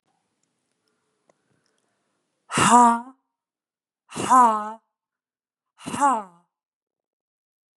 {"exhalation_length": "7.8 s", "exhalation_amplitude": 30051, "exhalation_signal_mean_std_ratio": 0.3, "survey_phase": "beta (2021-08-13 to 2022-03-07)", "age": "18-44", "gender": "Female", "wearing_mask": "No", "symptom_sore_throat": true, "symptom_abdominal_pain": true, "symptom_fatigue": true, "symptom_headache": true, "symptom_change_to_sense_of_smell_or_taste": true, "symptom_other": true, "symptom_onset": "3 days", "smoker_status": "Never smoked", "respiratory_condition_asthma": false, "respiratory_condition_other": false, "recruitment_source": "Test and Trace", "submission_delay": "2 days", "covid_test_result": "Negative", "covid_test_method": "RT-qPCR"}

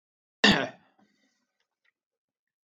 {"cough_length": "2.6 s", "cough_amplitude": 16760, "cough_signal_mean_std_ratio": 0.21, "survey_phase": "beta (2021-08-13 to 2022-03-07)", "age": "45-64", "gender": "Male", "wearing_mask": "No", "symptom_none": true, "smoker_status": "Ex-smoker", "respiratory_condition_asthma": false, "respiratory_condition_other": false, "recruitment_source": "REACT", "submission_delay": "2 days", "covid_test_result": "Negative", "covid_test_method": "RT-qPCR"}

